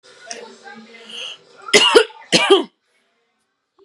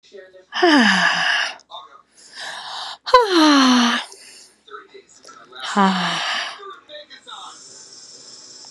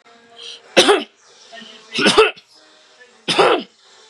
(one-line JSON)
{"cough_length": "3.8 s", "cough_amplitude": 32768, "cough_signal_mean_std_ratio": 0.35, "exhalation_length": "8.7 s", "exhalation_amplitude": 32767, "exhalation_signal_mean_std_ratio": 0.5, "three_cough_length": "4.1 s", "three_cough_amplitude": 32768, "three_cough_signal_mean_std_ratio": 0.4, "survey_phase": "beta (2021-08-13 to 2022-03-07)", "age": "18-44", "gender": "Female", "wearing_mask": "No", "symptom_none": true, "smoker_status": "Never smoked", "respiratory_condition_asthma": false, "respiratory_condition_other": false, "recruitment_source": "REACT", "submission_delay": "5 days", "covid_test_result": "Negative", "covid_test_method": "RT-qPCR", "influenza_a_test_result": "Negative", "influenza_b_test_result": "Negative"}